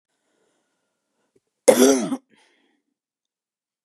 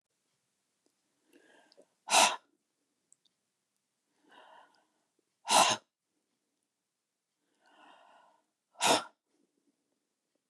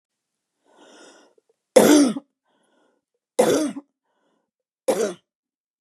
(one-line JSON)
{"cough_length": "3.8 s", "cough_amplitude": 32497, "cough_signal_mean_std_ratio": 0.24, "exhalation_length": "10.5 s", "exhalation_amplitude": 10003, "exhalation_signal_mean_std_ratio": 0.21, "three_cough_length": "5.8 s", "three_cough_amplitude": 31798, "three_cough_signal_mean_std_ratio": 0.31, "survey_phase": "beta (2021-08-13 to 2022-03-07)", "age": "45-64", "gender": "Female", "wearing_mask": "No", "symptom_none": true, "smoker_status": "Current smoker (e-cigarettes or vapes only)", "respiratory_condition_asthma": false, "respiratory_condition_other": false, "recruitment_source": "REACT", "submission_delay": "6 days", "covid_test_result": "Negative", "covid_test_method": "RT-qPCR", "influenza_a_test_result": "Negative", "influenza_b_test_result": "Negative"}